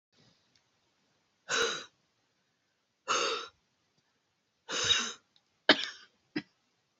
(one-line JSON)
{"exhalation_length": "7.0 s", "exhalation_amplitude": 15720, "exhalation_signal_mean_std_ratio": 0.31, "survey_phase": "beta (2021-08-13 to 2022-03-07)", "age": "18-44", "gender": "Female", "wearing_mask": "No", "symptom_cough_any": true, "symptom_runny_or_blocked_nose": true, "symptom_shortness_of_breath": true, "symptom_fatigue": true, "symptom_headache": true, "smoker_status": "Never smoked", "respiratory_condition_asthma": false, "respiratory_condition_other": false, "recruitment_source": "Test and Trace", "submission_delay": "3 days", "covid_test_result": "Positive", "covid_test_method": "RT-qPCR", "covid_ct_value": 17.3, "covid_ct_gene": "N gene"}